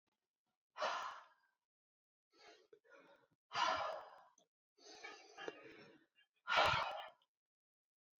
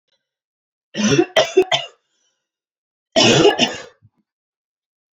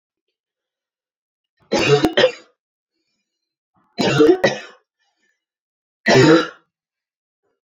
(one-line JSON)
{"exhalation_length": "8.2 s", "exhalation_amplitude": 2919, "exhalation_signal_mean_std_ratio": 0.35, "cough_length": "5.1 s", "cough_amplitude": 29507, "cough_signal_mean_std_ratio": 0.38, "three_cough_length": "7.8 s", "three_cough_amplitude": 32364, "three_cough_signal_mean_std_ratio": 0.34, "survey_phase": "alpha (2021-03-01 to 2021-08-12)", "age": "18-44", "gender": "Female", "wearing_mask": "No", "symptom_cough_any": true, "symptom_fatigue": true, "smoker_status": "Never smoked", "respiratory_condition_asthma": false, "respiratory_condition_other": false, "recruitment_source": "Test and Trace", "submission_delay": "2 days", "covid_test_result": "Positive", "covid_test_method": "RT-qPCR", "covid_ct_value": 19.7, "covid_ct_gene": "N gene", "covid_ct_mean": 20.2, "covid_viral_load": "240000 copies/ml", "covid_viral_load_category": "Low viral load (10K-1M copies/ml)"}